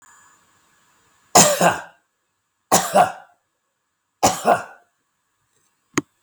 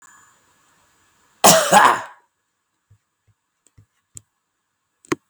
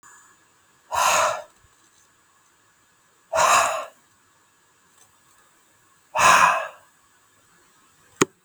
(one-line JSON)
{"three_cough_length": "6.2 s", "three_cough_amplitude": 32768, "three_cough_signal_mean_std_ratio": 0.31, "cough_length": "5.3 s", "cough_amplitude": 32768, "cough_signal_mean_std_ratio": 0.26, "exhalation_length": "8.4 s", "exhalation_amplitude": 32766, "exhalation_signal_mean_std_ratio": 0.34, "survey_phase": "beta (2021-08-13 to 2022-03-07)", "age": "65+", "gender": "Male", "wearing_mask": "No", "symptom_none": true, "symptom_onset": "11 days", "smoker_status": "Never smoked", "respiratory_condition_asthma": false, "respiratory_condition_other": false, "recruitment_source": "REACT", "submission_delay": "1 day", "covid_test_result": "Negative", "covid_test_method": "RT-qPCR", "influenza_a_test_result": "Negative", "influenza_b_test_result": "Negative"}